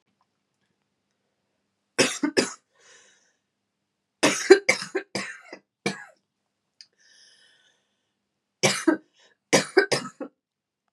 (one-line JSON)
{"three_cough_length": "10.9 s", "three_cough_amplitude": 31701, "three_cough_signal_mean_std_ratio": 0.26, "survey_phase": "beta (2021-08-13 to 2022-03-07)", "age": "45-64", "gender": "Female", "wearing_mask": "No", "symptom_cough_any": true, "symptom_runny_or_blocked_nose": true, "symptom_shortness_of_breath": true, "symptom_sore_throat": true, "symptom_fatigue": true, "symptom_headache": true, "symptom_onset": "3 days", "smoker_status": "Never smoked", "respiratory_condition_asthma": false, "respiratory_condition_other": false, "recruitment_source": "Test and Trace", "submission_delay": "2 days", "covid_test_result": "Positive", "covid_test_method": "RT-qPCR", "covid_ct_value": 24.5, "covid_ct_gene": "N gene"}